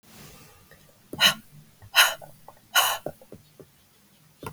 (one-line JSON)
{"exhalation_length": "4.5 s", "exhalation_amplitude": 22471, "exhalation_signal_mean_std_ratio": 0.31, "survey_phase": "beta (2021-08-13 to 2022-03-07)", "age": "45-64", "gender": "Female", "wearing_mask": "No", "symptom_cough_any": true, "symptom_runny_or_blocked_nose": true, "symptom_diarrhoea": true, "symptom_fatigue": true, "symptom_fever_high_temperature": true, "symptom_change_to_sense_of_smell_or_taste": true, "symptom_loss_of_taste": true, "symptom_onset": "2 days", "smoker_status": "Never smoked", "respiratory_condition_asthma": false, "respiratory_condition_other": false, "recruitment_source": "Test and Trace", "submission_delay": "1 day", "covid_test_result": "Positive", "covid_test_method": "RT-qPCR", "covid_ct_value": 18.0, "covid_ct_gene": "ORF1ab gene", "covid_ct_mean": 18.6, "covid_viral_load": "820000 copies/ml", "covid_viral_load_category": "Low viral load (10K-1M copies/ml)"}